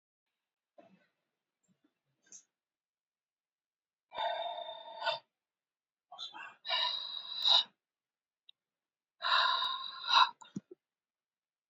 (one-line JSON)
{"exhalation_length": "11.7 s", "exhalation_amplitude": 7325, "exhalation_signal_mean_std_ratio": 0.34, "survey_phase": "beta (2021-08-13 to 2022-03-07)", "age": "18-44", "gender": "Female", "wearing_mask": "No", "symptom_none": true, "smoker_status": "Ex-smoker", "respiratory_condition_asthma": false, "respiratory_condition_other": false, "recruitment_source": "REACT", "submission_delay": "1 day", "covid_test_result": "Negative", "covid_test_method": "RT-qPCR", "influenza_a_test_result": "Negative", "influenza_b_test_result": "Negative"}